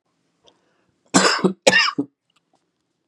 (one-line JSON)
{"cough_length": "3.1 s", "cough_amplitude": 32767, "cough_signal_mean_std_ratio": 0.35, "survey_phase": "beta (2021-08-13 to 2022-03-07)", "age": "45-64", "gender": "Male", "wearing_mask": "No", "symptom_runny_or_blocked_nose": true, "symptom_onset": "5 days", "smoker_status": "Never smoked", "respiratory_condition_asthma": false, "respiratory_condition_other": false, "recruitment_source": "REACT", "submission_delay": "2 days", "covid_test_result": "Negative", "covid_test_method": "RT-qPCR", "influenza_a_test_result": "Negative", "influenza_b_test_result": "Negative"}